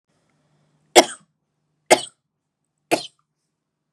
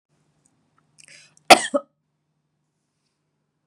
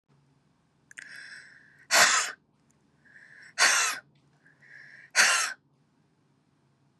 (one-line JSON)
{"three_cough_length": "3.9 s", "three_cough_amplitude": 32768, "three_cough_signal_mean_std_ratio": 0.17, "cough_length": "3.7 s", "cough_amplitude": 32768, "cough_signal_mean_std_ratio": 0.14, "exhalation_length": "7.0 s", "exhalation_amplitude": 16084, "exhalation_signal_mean_std_ratio": 0.33, "survey_phase": "beta (2021-08-13 to 2022-03-07)", "age": "18-44", "gender": "Female", "wearing_mask": "No", "symptom_fatigue": true, "symptom_headache": true, "symptom_onset": "13 days", "smoker_status": "Never smoked", "respiratory_condition_asthma": false, "respiratory_condition_other": false, "recruitment_source": "REACT", "submission_delay": "2 days", "covid_test_result": "Negative", "covid_test_method": "RT-qPCR", "influenza_a_test_result": "Negative", "influenza_b_test_result": "Negative"}